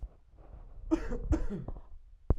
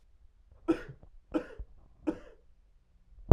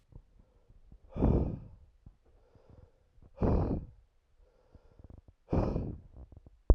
cough_length: 2.4 s
cough_amplitude: 8837
cough_signal_mean_std_ratio: 0.57
three_cough_length: 3.3 s
three_cough_amplitude: 29805
three_cough_signal_mean_std_ratio: 0.18
exhalation_length: 6.7 s
exhalation_amplitude: 13266
exhalation_signal_mean_std_ratio: 0.35
survey_phase: alpha (2021-03-01 to 2021-08-12)
age: 18-44
gender: Male
wearing_mask: 'No'
symptom_cough_any: true
symptom_change_to_sense_of_smell_or_taste: true
symptom_onset: 2 days
smoker_status: Current smoker (1 to 10 cigarettes per day)
respiratory_condition_asthma: false
respiratory_condition_other: false
recruitment_source: Test and Trace
submission_delay: 2 days
covid_test_result: Positive
covid_test_method: RT-qPCR
covid_ct_value: 19.3
covid_ct_gene: ORF1ab gene
covid_ct_mean: 20.7
covid_viral_load: 160000 copies/ml
covid_viral_load_category: Low viral load (10K-1M copies/ml)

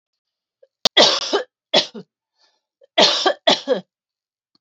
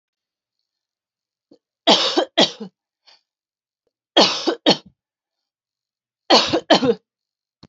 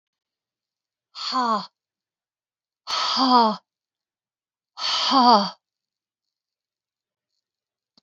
cough_length: 4.6 s
cough_amplitude: 30950
cough_signal_mean_std_ratio: 0.37
three_cough_length: 7.7 s
three_cough_amplitude: 32767
three_cough_signal_mean_std_ratio: 0.32
exhalation_length: 8.0 s
exhalation_amplitude: 22909
exhalation_signal_mean_std_ratio: 0.34
survey_phase: beta (2021-08-13 to 2022-03-07)
age: 45-64
gender: Female
wearing_mask: 'No'
symptom_abdominal_pain: true
symptom_onset: 12 days
smoker_status: Never smoked
respiratory_condition_asthma: false
respiratory_condition_other: false
recruitment_source: REACT
submission_delay: 1 day
covid_test_result: Negative
covid_test_method: RT-qPCR
influenza_a_test_result: Negative
influenza_b_test_result: Negative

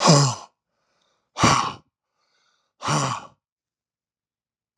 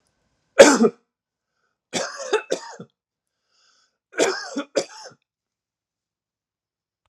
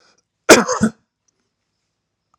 exhalation_length: 4.8 s
exhalation_amplitude: 25957
exhalation_signal_mean_std_ratio: 0.35
three_cough_length: 7.1 s
three_cough_amplitude: 32768
three_cough_signal_mean_std_ratio: 0.24
cough_length: 2.4 s
cough_amplitude: 32768
cough_signal_mean_std_ratio: 0.26
survey_phase: alpha (2021-03-01 to 2021-08-12)
age: 45-64
gender: Male
wearing_mask: 'No'
symptom_none: true
smoker_status: Never smoked
respiratory_condition_asthma: false
respiratory_condition_other: false
recruitment_source: Test and Trace
submission_delay: 0 days
covid_test_result: Negative
covid_test_method: LFT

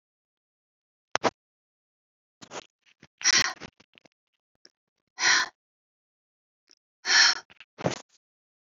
exhalation_length: 8.8 s
exhalation_amplitude: 18491
exhalation_signal_mean_std_ratio: 0.26
survey_phase: beta (2021-08-13 to 2022-03-07)
age: 45-64
gender: Female
wearing_mask: 'No'
symptom_none: true
smoker_status: Never smoked
respiratory_condition_asthma: false
respiratory_condition_other: false
recruitment_source: REACT
submission_delay: 1 day
covid_test_result: Negative
covid_test_method: RT-qPCR
influenza_a_test_result: Negative
influenza_b_test_result: Negative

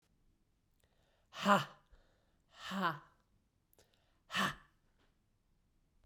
exhalation_length: 6.1 s
exhalation_amplitude: 5250
exhalation_signal_mean_std_ratio: 0.27
survey_phase: beta (2021-08-13 to 2022-03-07)
age: 18-44
gender: Female
wearing_mask: 'No'
symptom_cough_any: true
symptom_runny_or_blocked_nose: true
symptom_fatigue: true
symptom_fever_high_temperature: true
symptom_headache: true
symptom_change_to_sense_of_smell_or_taste: true
symptom_loss_of_taste: true
symptom_other: true
symptom_onset: 4 days
smoker_status: Ex-smoker
respiratory_condition_asthma: false
respiratory_condition_other: false
recruitment_source: Test and Trace
submission_delay: 2 days
covid_test_result: Positive
covid_test_method: RT-qPCR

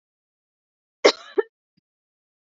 cough_length: 2.5 s
cough_amplitude: 27304
cough_signal_mean_std_ratio: 0.16
survey_phase: beta (2021-08-13 to 2022-03-07)
age: 18-44
gender: Female
wearing_mask: 'No'
symptom_cough_any: true
symptom_fatigue: true
symptom_headache: true
symptom_onset: 6 days
smoker_status: Never smoked
respiratory_condition_asthma: false
respiratory_condition_other: false
recruitment_source: Test and Trace
submission_delay: 1 day
covid_test_result: Positive
covid_test_method: ePCR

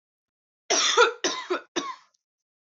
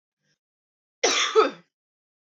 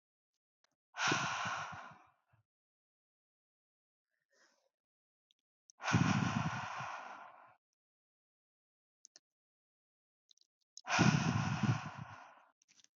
three_cough_length: 2.7 s
three_cough_amplitude: 14459
three_cough_signal_mean_std_ratio: 0.42
cough_length: 2.4 s
cough_amplitude: 13238
cough_signal_mean_std_ratio: 0.33
exhalation_length: 13.0 s
exhalation_amplitude: 4653
exhalation_signal_mean_std_ratio: 0.36
survey_phase: beta (2021-08-13 to 2022-03-07)
age: 18-44
gender: Female
wearing_mask: 'No'
symptom_cough_any: true
symptom_runny_or_blocked_nose: true
symptom_fatigue: true
symptom_onset: 12 days
smoker_status: Never smoked
respiratory_condition_asthma: true
respiratory_condition_other: false
recruitment_source: REACT
submission_delay: 1 day
covid_test_result: Negative
covid_test_method: RT-qPCR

